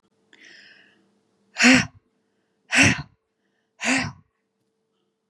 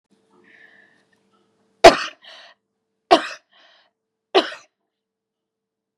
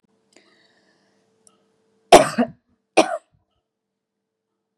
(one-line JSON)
{"exhalation_length": "5.3 s", "exhalation_amplitude": 30109, "exhalation_signal_mean_std_ratio": 0.29, "three_cough_length": "6.0 s", "three_cough_amplitude": 32768, "three_cough_signal_mean_std_ratio": 0.18, "cough_length": "4.8 s", "cough_amplitude": 32768, "cough_signal_mean_std_ratio": 0.19, "survey_phase": "beta (2021-08-13 to 2022-03-07)", "age": "45-64", "gender": "Female", "wearing_mask": "No", "symptom_none": true, "smoker_status": "Never smoked", "respiratory_condition_asthma": false, "respiratory_condition_other": false, "recruitment_source": "REACT", "submission_delay": "3 days", "covid_test_result": "Negative", "covid_test_method": "RT-qPCR", "influenza_a_test_result": "Negative", "influenza_b_test_result": "Negative"}